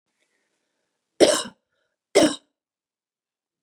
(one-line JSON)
{"cough_length": "3.6 s", "cough_amplitude": 27798, "cough_signal_mean_std_ratio": 0.24, "survey_phase": "beta (2021-08-13 to 2022-03-07)", "age": "45-64", "gender": "Female", "wearing_mask": "No", "symptom_none": true, "smoker_status": "Never smoked", "respiratory_condition_asthma": false, "respiratory_condition_other": false, "recruitment_source": "REACT", "submission_delay": "3 days", "covid_test_result": "Negative", "covid_test_method": "RT-qPCR", "influenza_a_test_result": "Negative", "influenza_b_test_result": "Negative"}